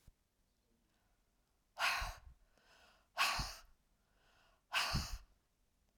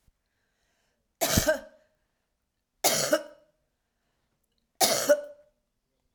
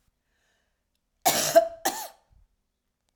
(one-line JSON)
{"exhalation_length": "6.0 s", "exhalation_amplitude": 2714, "exhalation_signal_mean_std_ratio": 0.36, "three_cough_length": "6.1 s", "three_cough_amplitude": 16808, "three_cough_signal_mean_std_ratio": 0.33, "cough_length": "3.2 s", "cough_amplitude": 16912, "cough_signal_mean_std_ratio": 0.29, "survey_phase": "alpha (2021-03-01 to 2021-08-12)", "age": "45-64", "gender": "Female", "wearing_mask": "No", "symptom_none": true, "smoker_status": "Never smoked", "respiratory_condition_asthma": false, "respiratory_condition_other": false, "recruitment_source": "REACT", "submission_delay": "1 day", "covid_test_result": "Negative", "covid_test_method": "RT-qPCR"}